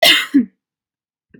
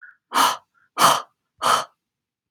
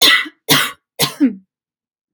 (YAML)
cough_length: 1.4 s
cough_amplitude: 32767
cough_signal_mean_std_ratio: 0.4
exhalation_length: 2.5 s
exhalation_amplitude: 30316
exhalation_signal_mean_std_ratio: 0.41
three_cough_length: 2.1 s
three_cough_amplitude: 32768
three_cough_signal_mean_std_ratio: 0.46
survey_phase: beta (2021-08-13 to 2022-03-07)
age: 18-44
gender: Female
wearing_mask: 'No'
symptom_none: true
symptom_onset: 12 days
smoker_status: Ex-smoker
respiratory_condition_asthma: false
respiratory_condition_other: false
recruitment_source: REACT
submission_delay: 1 day
covid_test_result: Negative
covid_test_method: RT-qPCR
influenza_a_test_result: Negative
influenza_b_test_result: Negative